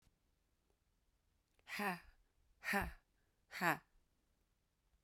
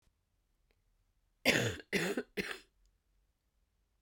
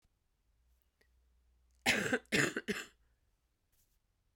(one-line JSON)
{"exhalation_length": "5.0 s", "exhalation_amplitude": 2617, "exhalation_signal_mean_std_ratio": 0.29, "three_cough_length": "4.0 s", "three_cough_amplitude": 6891, "three_cough_signal_mean_std_ratio": 0.33, "cough_length": "4.4 s", "cough_amplitude": 5080, "cough_signal_mean_std_ratio": 0.31, "survey_phase": "beta (2021-08-13 to 2022-03-07)", "age": "18-44", "gender": "Female", "wearing_mask": "No", "symptom_cough_any": true, "symptom_onset": "8 days", "smoker_status": "Current smoker (e-cigarettes or vapes only)", "respiratory_condition_asthma": false, "respiratory_condition_other": false, "recruitment_source": "REACT", "submission_delay": "4 days", "covid_test_result": "Negative", "covid_test_method": "RT-qPCR"}